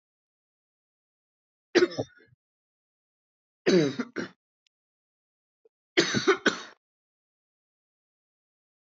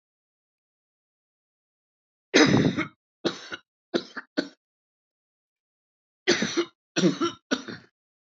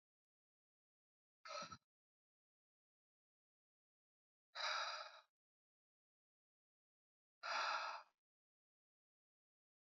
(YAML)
three_cough_length: 9.0 s
three_cough_amplitude: 14049
three_cough_signal_mean_std_ratio: 0.25
cough_length: 8.4 s
cough_amplitude: 19498
cough_signal_mean_std_ratio: 0.31
exhalation_length: 9.9 s
exhalation_amplitude: 1056
exhalation_signal_mean_std_ratio: 0.29
survey_phase: beta (2021-08-13 to 2022-03-07)
age: 45-64
gender: Female
wearing_mask: 'No'
symptom_none: true
smoker_status: Never smoked
respiratory_condition_asthma: false
respiratory_condition_other: false
recruitment_source: Test and Trace
submission_delay: 0 days
covid_test_result: Negative
covid_test_method: LFT